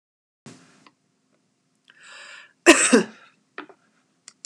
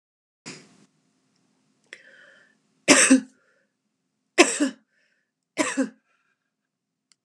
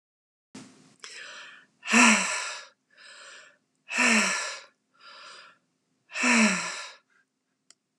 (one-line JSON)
{"cough_length": "4.5 s", "cough_amplitude": 32767, "cough_signal_mean_std_ratio": 0.22, "three_cough_length": "7.2 s", "three_cough_amplitude": 31344, "three_cough_signal_mean_std_ratio": 0.25, "exhalation_length": "8.0 s", "exhalation_amplitude": 16611, "exhalation_signal_mean_std_ratio": 0.39, "survey_phase": "beta (2021-08-13 to 2022-03-07)", "age": "65+", "gender": "Female", "wearing_mask": "No", "symptom_none": true, "symptom_onset": "10 days", "smoker_status": "Ex-smoker", "respiratory_condition_asthma": false, "respiratory_condition_other": false, "recruitment_source": "REACT", "submission_delay": "1 day", "covid_test_result": "Negative", "covid_test_method": "RT-qPCR", "influenza_a_test_result": "Negative", "influenza_b_test_result": "Negative"}